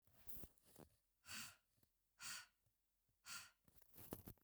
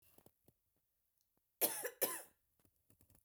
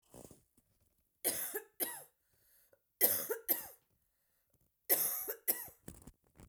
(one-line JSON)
{"exhalation_length": "4.4 s", "exhalation_amplitude": 773, "exhalation_signal_mean_std_ratio": 0.48, "cough_length": "3.2 s", "cough_amplitude": 3912, "cough_signal_mean_std_ratio": 0.27, "three_cough_length": "6.5 s", "three_cough_amplitude": 8401, "three_cough_signal_mean_std_ratio": 0.36, "survey_phase": "beta (2021-08-13 to 2022-03-07)", "age": "18-44", "gender": "Female", "wearing_mask": "No", "symptom_cough_any": true, "symptom_runny_or_blocked_nose": true, "symptom_fatigue": true, "symptom_headache": true, "symptom_onset": "3 days", "smoker_status": "Never smoked", "respiratory_condition_asthma": false, "respiratory_condition_other": false, "recruitment_source": "Test and Trace", "submission_delay": "2 days", "covid_test_result": "Positive", "covid_test_method": "RT-qPCR", "covid_ct_value": 15.9, "covid_ct_gene": "ORF1ab gene", "covid_ct_mean": 16.5, "covid_viral_load": "3900000 copies/ml", "covid_viral_load_category": "High viral load (>1M copies/ml)"}